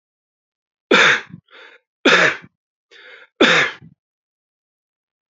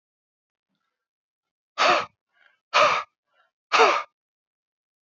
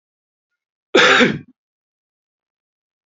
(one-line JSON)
{"three_cough_length": "5.3 s", "three_cough_amplitude": 32767, "three_cough_signal_mean_std_ratio": 0.34, "exhalation_length": "5.0 s", "exhalation_amplitude": 22251, "exhalation_signal_mean_std_ratio": 0.32, "cough_length": "3.1 s", "cough_amplitude": 32299, "cough_signal_mean_std_ratio": 0.29, "survey_phase": "beta (2021-08-13 to 2022-03-07)", "age": "45-64", "gender": "Male", "wearing_mask": "No", "symptom_cough_any": true, "symptom_runny_or_blocked_nose": true, "symptom_fatigue": true, "symptom_change_to_sense_of_smell_or_taste": true, "symptom_loss_of_taste": true, "symptom_other": true, "symptom_onset": "4 days", "smoker_status": "Never smoked", "respiratory_condition_asthma": false, "respiratory_condition_other": false, "recruitment_source": "Test and Trace", "submission_delay": "2 days", "covid_test_result": "Positive", "covid_test_method": "RT-qPCR", "covid_ct_value": 15.0, "covid_ct_gene": "ORF1ab gene", "covid_ct_mean": 15.1, "covid_viral_load": "11000000 copies/ml", "covid_viral_load_category": "High viral load (>1M copies/ml)"}